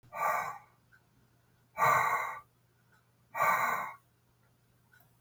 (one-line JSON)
{"exhalation_length": "5.2 s", "exhalation_amplitude": 5671, "exhalation_signal_mean_std_ratio": 0.45, "survey_phase": "beta (2021-08-13 to 2022-03-07)", "age": "65+", "gender": "Male", "wearing_mask": "No", "symptom_none": true, "smoker_status": "Never smoked", "respiratory_condition_asthma": false, "respiratory_condition_other": false, "recruitment_source": "REACT", "submission_delay": "6 days", "covid_test_result": "Negative", "covid_test_method": "RT-qPCR", "influenza_a_test_result": "Negative", "influenza_b_test_result": "Negative"}